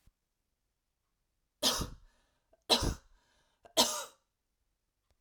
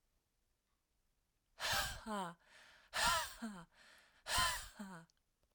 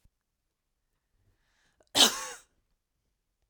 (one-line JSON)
{"three_cough_length": "5.2 s", "three_cough_amplitude": 9231, "three_cough_signal_mean_std_ratio": 0.28, "exhalation_length": "5.5 s", "exhalation_amplitude": 2540, "exhalation_signal_mean_std_ratio": 0.45, "cough_length": "3.5 s", "cough_amplitude": 15592, "cough_signal_mean_std_ratio": 0.19, "survey_phase": "beta (2021-08-13 to 2022-03-07)", "age": "18-44", "gender": "Female", "wearing_mask": "No", "symptom_runny_or_blocked_nose": true, "symptom_fatigue": true, "symptom_headache": true, "symptom_onset": "3 days", "smoker_status": "Never smoked", "respiratory_condition_asthma": false, "respiratory_condition_other": false, "recruitment_source": "Test and Trace", "submission_delay": "2 days", "covid_test_result": "Positive", "covid_test_method": "ePCR"}